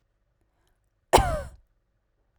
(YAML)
cough_length: 2.4 s
cough_amplitude: 31004
cough_signal_mean_std_ratio: 0.23
survey_phase: beta (2021-08-13 to 2022-03-07)
age: 18-44
gender: Female
wearing_mask: 'No'
symptom_none: true
smoker_status: Never smoked
respiratory_condition_asthma: false
respiratory_condition_other: false
recruitment_source: REACT
submission_delay: 0 days
covid_test_result: Negative
covid_test_method: RT-qPCR